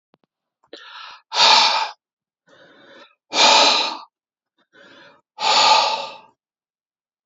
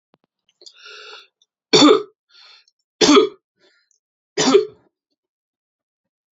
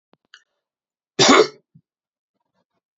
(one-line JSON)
{"exhalation_length": "7.3 s", "exhalation_amplitude": 30256, "exhalation_signal_mean_std_ratio": 0.41, "three_cough_length": "6.4 s", "three_cough_amplitude": 29248, "three_cough_signal_mean_std_ratio": 0.29, "cough_length": "3.0 s", "cough_amplitude": 28003, "cough_signal_mean_std_ratio": 0.24, "survey_phase": "beta (2021-08-13 to 2022-03-07)", "age": "45-64", "gender": "Male", "wearing_mask": "No", "symptom_none": true, "smoker_status": "Ex-smoker", "respiratory_condition_asthma": false, "respiratory_condition_other": false, "recruitment_source": "REACT", "submission_delay": "3 days", "covid_test_result": "Negative", "covid_test_method": "RT-qPCR", "influenza_a_test_result": "Negative", "influenza_b_test_result": "Negative"}